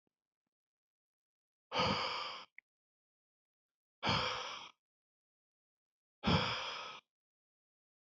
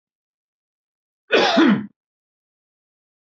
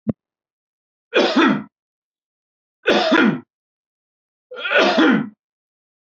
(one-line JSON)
{"exhalation_length": "8.1 s", "exhalation_amplitude": 3667, "exhalation_signal_mean_std_ratio": 0.36, "cough_length": "3.2 s", "cough_amplitude": 24005, "cough_signal_mean_std_ratio": 0.32, "three_cough_length": "6.1 s", "three_cough_amplitude": 26057, "three_cough_signal_mean_std_ratio": 0.43, "survey_phase": "beta (2021-08-13 to 2022-03-07)", "age": "18-44", "gender": "Male", "wearing_mask": "No", "symptom_none": true, "smoker_status": "Never smoked", "respiratory_condition_asthma": false, "respiratory_condition_other": false, "recruitment_source": "REACT", "submission_delay": "1 day", "covid_test_result": "Negative", "covid_test_method": "RT-qPCR", "influenza_a_test_result": "Unknown/Void", "influenza_b_test_result": "Unknown/Void"}